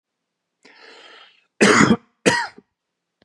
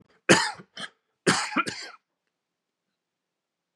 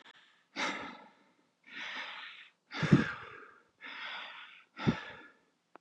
{
  "cough_length": "3.2 s",
  "cough_amplitude": 32617,
  "cough_signal_mean_std_ratio": 0.33,
  "three_cough_length": "3.8 s",
  "three_cough_amplitude": 24442,
  "three_cough_signal_mean_std_ratio": 0.29,
  "exhalation_length": "5.8 s",
  "exhalation_amplitude": 10446,
  "exhalation_signal_mean_std_ratio": 0.36,
  "survey_phase": "beta (2021-08-13 to 2022-03-07)",
  "age": "45-64",
  "gender": "Male",
  "wearing_mask": "No",
  "symptom_none": true,
  "smoker_status": "Never smoked",
  "respiratory_condition_asthma": false,
  "respiratory_condition_other": false,
  "recruitment_source": "REACT",
  "submission_delay": "2 days",
  "covid_test_result": "Negative",
  "covid_test_method": "RT-qPCR",
  "influenza_a_test_result": "Negative",
  "influenza_b_test_result": "Negative"
}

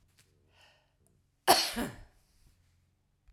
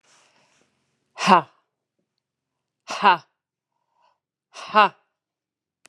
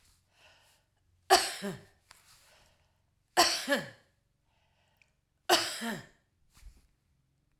{
  "cough_length": "3.3 s",
  "cough_amplitude": 14985,
  "cough_signal_mean_std_ratio": 0.24,
  "exhalation_length": "5.9 s",
  "exhalation_amplitude": 32540,
  "exhalation_signal_mean_std_ratio": 0.22,
  "three_cough_length": "7.6 s",
  "three_cough_amplitude": 13347,
  "three_cough_signal_mean_std_ratio": 0.28,
  "survey_phase": "alpha (2021-03-01 to 2021-08-12)",
  "age": "65+",
  "gender": "Female",
  "wearing_mask": "No",
  "symptom_none": true,
  "smoker_status": "Ex-smoker",
  "respiratory_condition_asthma": false,
  "respiratory_condition_other": false,
  "recruitment_source": "REACT",
  "submission_delay": "1 day",
  "covid_test_result": "Negative",
  "covid_test_method": "RT-qPCR"
}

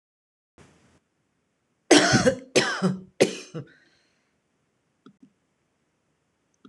{
  "cough_length": "6.7 s",
  "cough_amplitude": 25313,
  "cough_signal_mean_std_ratio": 0.28,
  "survey_phase": "alpha (2021-03-01 to 2021-08-12)",
  "age": "45-64",
  "gender": "Female",
  "wearing_mask": "No",
  "symptom_none": true,
  "smoker_status": "Ex-smoker",
  "respiratory_condition_asthma": false,
  "respiratory_condition_other": false,
  "recruitment_source": "REACT",
  "submission_delay": "2 days",
  "covid_test_result": "Negative",
  "covid_test_method": "RT-qPCR"
}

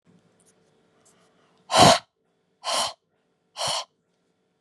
{
  "exhalation_length": "4.6 s",
  "exhalation_amplitude": 28510,
  "exhalation_signal_mean_std_ratio": 0.27,
  "survey_phase": "beta (2021-08-13 to 2022-03-07)",
  "age": "45-64",
  "gender": "Female",
  "wearing_mask": "No",
  "symptom_sore_throat": true,
  "symptom_onset": "5 days",
  "smoker_status": "Never smoked",
  "respiratory_condition_asthma": false,
  "respiratory_condition_other": false,
  "recruitment_source": "Test and Trace",
  "submission_delay": "2 days",
  "covid_test_result": "Positive",
  "covid_test_method": "LAMP"
}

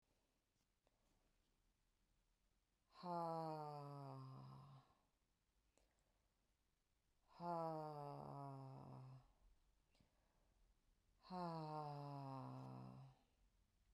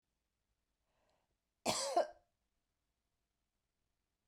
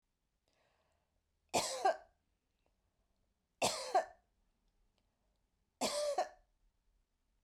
{
  "exhalation_length": "13.9 s",
  "exhalation_amplitude": 501,
  "exhalation_signal_mean_std_ratio": 0.53,
  "cough_length": "4.3 s",
  "cough_amplitude": 3096,
  "cough_signal_mean_std_ratio": 0.23,
  "three_cough_length": "7.4 s",
  "three_cough_amplitude": 3443,
  "three_cough_signal_mean_std_ratio": 0.31,
  "survey_phase": "beta (2021-08-13 to 2022-03-07)",
  "age": "45-64",
  "gender": "Female",
  "wearing_mask": "No",
  "symptom_none": true,
  "smoker_status": "Never smoked",
  "respiratory_condition_asthma": false,
  "respiratory_condition_other": false,
  "recruitment_source": "REACT",
  "submission_delay": "2 days",
  "covid_test_result": "Negative",
  "covid_test_method": "RT-qPCR"
}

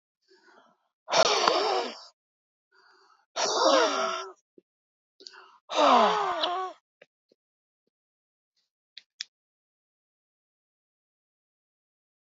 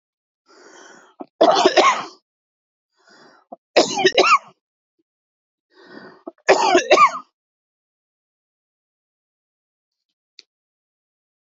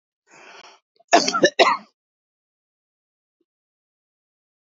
{
  "exhalation_length": "12.4 s",
  "exhalation_amplitude": 26409,
  "exhalation_signal_mean_std_ratio": 0.36,
  "three_cough_length": "11.4 s",
  "three_cough_amplitude": 32768,
  "three_cough_signal_mean_std_ratio": 0.3,
  "cough_length": "4.6 s",
  "cough_amplitude": 28688,
  "cough_signal_mean_std_ratio": 0.24,
  "survey_phase": "beta (2021-08-13 to 2022-03-07)",
  "age": "45-64",
  "gender": "Female",
  "wearing_mask": "Yes",
  "symptom_cough_any": true,
  "symptom_runny_or_blocked_nose": true,
  "symptom_sore_throat": true,
  "symptom_fatigue": true,
  "symptom_headache": true,
  "smoker_status": "Ex-smoker",
  "respiratory_condition_asthma": true,
  "respiratory_condition_other": false,
  "recruitment_source": "Test and Trace",
  "submission_delay": "2 days",
  "covid_test_result": "Positive",
  "covid_test_method": "RT-qPCR",
  "covid_ct_value": 26.2,
  "covid_ct_gene": "ORF1ab gene",
  "covid_ct_mean": 26.9,
  "covid_viral_load": "1500 copies/ml",
  "covid_viral_load_category": "Minimal viral load (< 10K copies/ml)"
}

